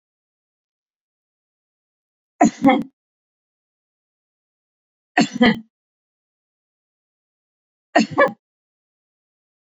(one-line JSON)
{"three_cough_length": "9.7 s", "three_cough_amplitude": 28492, "three_cough_signal_mean_std_ratio": 0.22, "survey_phase": "beta (2021-08-13 to 2022-03-07)", "age": "45-64", "gender": "Female", "wearing_mask": "No", "symptom_sore_throat": true, "symptom_fatigue": true, "symptom_onset": "13 days", "smoker_status": "Never smoked", "respiratory_condition_asthma": false, "respiratory_condition_other": false, "recruitment_source": "REACT", "submission_delay": "8 days", "covid_test_result": "Negative", "covid_test_method": "RT-qPCR"}